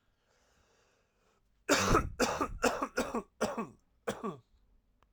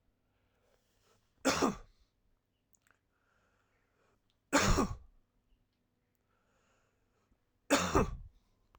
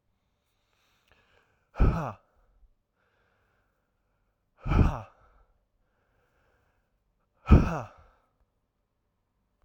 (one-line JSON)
{"cough_length": "5.1 s", "cough_amplitude": 7115, "cough_signal_mean_std_ratio": 0.43, "three_cough_length": "8.8 s", "three_cough_amplitude": 6926, "three_cough_signal_mean_std_ratio": 0.28, "exhalation_length": "9.6 s", "exhalation_amplitude": 22717, "exhalation_signal_mean_std_ratio": 0.21, "survey_phase": "alpha (2021-03-01 to 2021-08-12)", "age": "18-44", "gender": "Male", "wearing_mask": "No", "symptom_cough_any": true, "symptom_fatigue": true, "symptom_fever_high_temperature": true, "symptom_change_to_sense_of_smell_or_taste": true, "symptom_loss_of_taste": true, "smoker_status": "Never smoked", "respiratory_condition_asthma": false, "respiratory_condition_other": false, "recruitment_source": "Test and Trace", "submission_delay": "2 days", "covid_test_result": "Positive", "covid_test_method": "LFT"}